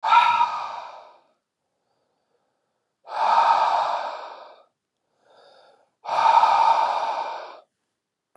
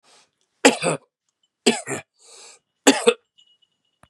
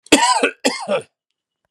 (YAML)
exhalation_length: 8.4 s
exhalation_amplitude: 19945
exhalation_signal_mean_std_ratio: 0.5
three_cough_length: 4.1 s
three_cough_amplitude: 32334
three_cough_signal_mean_std_ratio: 0.27
cough_length: 1.7 s
cough_amplitude: 32768
cough_signal_mean_std_ratio: 0.48
survey_phase: beta (2021-08-13 to 2022-03-07)
age: 45-64
gender: Male
wearing_mask: 'No'
symptom_shortness_of_breath: true
symptom_other: true
smoker_status: Never smoked
respiratory_condition_asthma: true
respiratory_condition_other: false
recruitment_source: Test and Trace
submission_delay: 2 days
covid_test_result: Positive
covid_test_method: RT-qPCR